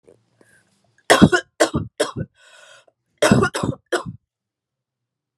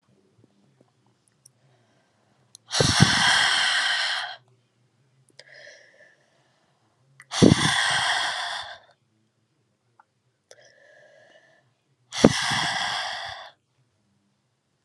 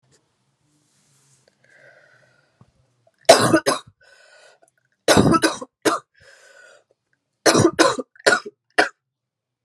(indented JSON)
{
  "cough_length": "5.4 s",
  "cough_amplitude": 32768,
  "cough_signal_mean_std_ratio": 0.32,
  "exhalation_length": "14.8 s",
  "exhalation_amplitude": 32768,
  "exhalation_signal_mean_std_ratio": 0.37,
  "three_cough_length": "9.6 s",
  "three_cough_amplitude": 32768,
  "three_cough_signal_mean_std_ratio": 0.31,
  "survey_phase": "alpha (2021-03-01 to 2021-08-12)",
  "age": "18-44",
  "gender": "Female",
  "wearing_mask": "No",
  "symptom_cough_any": true,
  "symptom_fatigue": true,
  "symptom_fever_high_temperature": true,
  "symptom_onset": "3 days",
  "smoker_status": "Never smoked",
  "respiratory_condition_asthma": false,
  "respiratory_condition_other": false,
  "recruitment_source": "Test and Trace",
  "submission_delay": "2 days",
  "covid_test_result": "Positive",
  "covid_test_method": "RT-qPCR",
  "covid_ct_value": 21.3,
  "covid_ct_gene": "S gene",
  "covid_ct_mean": 22.0,
  "covid_viral_load": "63000 copies/ml",
  "covid_viral_load_category": "Low viral load (10K-1M copies/ml)"
}